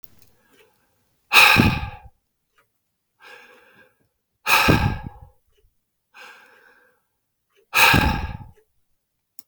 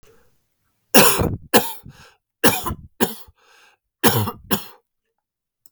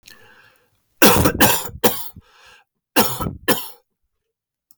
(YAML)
exhalation_length: 9.5 s
exhalation_amplitude: 32768
exhalation_signal_mean_std_ratio: 0.32
three_cough_length: 5.7 s
three_cough_amplitude: 32768
three_cough_signal_mean_std_ratio: 0.35
cough_length: 4.8 s
cough_amplitude: 32768
cough_signal_mean_std_ratio: 0.39
survey_phase: beta (2021-08-13 to 2022-03-07)
age: 45-64
gender: Male
wearing_mask: 'No'
symptom_none: true
smoker_status: Never smoked
respiratory_condition_asthma: false
respiratory_condition_other: false
recruitment_source: REACT
submission_delay: 2 days
covid_test_result: Negative
covid_test_method: RT-qPCR
influenza_a_test_result: Negative
influenza_b_test_result: Negative